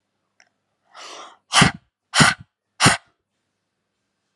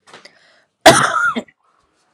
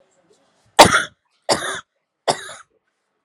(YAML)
exhalation_length: 4.4 s
exhalation_amplitude: 32765
exhalation_signal_mean_std_ratio: 0.27
cough_length: 2.1 s
cough_amplitude: 32768
cough_signal_mean_std_ratio: 0.36
three_cough_length: 3.2 s
three_cough_amplitude: 32768
three_cough_signal_mean_std_ratio: 0.27
survey_phase: beta (2021-08-13 to 2022-03-07)
age: 18-44
gender: Female
wearing_mask: 'No'
symptom_none: true
symptom_onset: 5 days
smoker_status: Never smoked
respiratory_condition_asthma: false
respiratory_condition_other: false
recruitment_source: REACT
submission_delay: 1 day
covid_test_result: Negative
covid_test_method: RT-qPCR
influenza_a_test_result: Negative
influenza_b_test_result: Negative